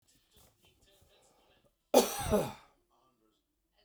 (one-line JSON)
{"cough_length": "3.8 s", "cough_amplitude": 12895, "cough_signal_mean_std_ratio": 0.26, "survey_phase": "beta (2021-08-13 to 2022-03-07)", "age": "45-64", "gender": "Male", "wearing_mask": "No", "symptom_none": true, "smoker_status": "Never smoked", "respiratory_condition_asthma": false, "respiratory_condition_other": false, "recruitment_source": "REACT", "submission_delay": "9 days", "covid_test_result": "Negative", "covid_test_method": "RT-qPCR", "influenza_a_test_result": "Negative", "influenza_b_test_result": "Negative"}